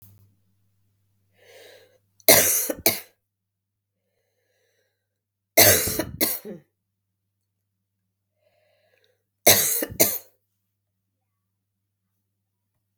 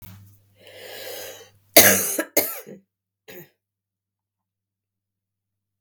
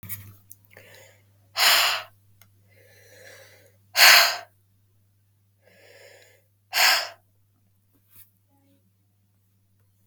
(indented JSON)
{
  "three_cough_length": "13.0 s",
  "three_cough_amplitude": 32768,
  "three_cough_signal_mean_std_ratio": 0.26,
  "cough_length": "5.8 s",
  "cough_amplitude": 32768,
  "cough_signal_mean_std_ratio": 0.25,
  "exhalation_length": "10.1 s",
  "exhalation_amplitude": 32768,
  "exhalation_signal_mean_std_ratio": 0.27,
  "survey_phase": "beta (2021-08-13 to 2022-03-07)",
  "age": "18-44",
  "gender": "Female",
  "wearing_mask": "No",
  "symptom_cough_any": true,
  "symptom_runny_or_blocked_nose": true,
  "symptom_fatigue": true,
  "symptom_headache": true,
  "symptom_onset": "3 days",
  "smoker_status": "Never smoked",
  "respiratory_condition_asthma": false,
  "respiratory_condition_other": false,
  "recruitment_source": "Test and Trace",
  "submission_delay": "1 day",
  "covid_test_result": "Positive",
  "covid_test_method": "RT-qPCR",
  "covid_ct_value": 20.1,
  "covid_ct_gene": "ORF1ab gene",
  "covid_ct_mean": 20.4,
  "covid_viral_load": "210000 copies/ml",
  "covid_viral_load_category": "Low viral load (10K-1M copies/ml)"
}